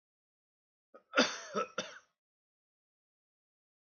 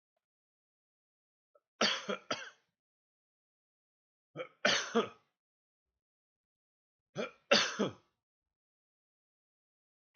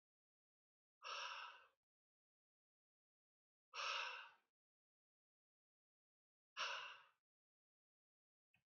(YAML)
cough_length: 3.8 s
cough_amplitude: 6471
cough_signal_mean_std_ratio: 0.24
three_cough_length: 10.2 s
three_cough_amplitude: 7262
three_cough_signal_mean_std_ratio: 0.25
exhalation_length: 8.7 s
exhalation_amplitude: 781
exhalation_signal_mean_std_ratio: 0.32
survey_phase: beta (2021-08-13 to 2022-03-07)
age: 45-64
gender: Male
wearing_mask: 'No'
symptom_cough_any: true
symptom_sore_throat: true
symptom_headache: true
symptom_onset: 4 days
smoker_status: Never smoked
respiratory_condition_asthma: false
respiratory_condition_other: false
recruitment_source: Test and Trace
submission_delay: 2 days
covid_test_result: Positive
covid_test_method: RT-qPCR
covid_ct_value: 21.1
covid_ct_gene: ORF1ab gene
covid_ct_mean: 21.6
covid_viral_load: 84000 copies/ml
covid_viral_load_category: Low viral load (10K-1M copies/ml)